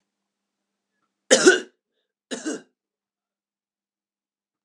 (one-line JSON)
{"cough_length": "4.6 s", "cough_amplitude": 31484, "cough_signal_mean_std_ratio": 0.2, "survey_phase": "alpha (2021-03-01 to 2021-08-12)", "age": "45-64", "gender": "Male", "wearing_mask": "No", "symptom_none": true, "smoker_status": "Current smoker (e-cigarettes or vapes only)", "respiratory_condition_asthma": false, "respiratory_condition_other": false, "recruitment_source": "REACT", "submission_delay": "2 days", "covid_test_result": "Negative", "covid_test_method": "RT-qPCR"}